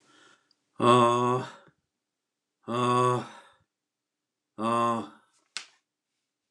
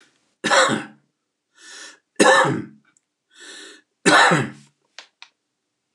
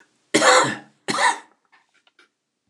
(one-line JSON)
{"exhalation_length": "6.5 s", "exhalation_amplitude": 14942, "exhalation_signal_mean_std_ratio": 0.39, "three_cough_length": "5.9 s", "three_cough_amplitude": 28911, "three_cough_signal_mean_std_ratio": 0.37, "cough_length": "2.7 s", "cough_amplitude": 26489, "cough_signal_mean_std_ratio": 0.39, "survey_phase": "beta (2021-08-13 to 2022-03-07)", "age": "65+", "gender": "Male", "wearing_mask": "No", "symptom_none": true, "smoker_status": "Never smoked", "respiratory_condition_asthma": false, "respiratory_condition_other": false, "recruitment_source": "REACT", "submission_delay": "1 day", "covid_test_result": "Negative", "covid_test_method": "RT-qPCR"}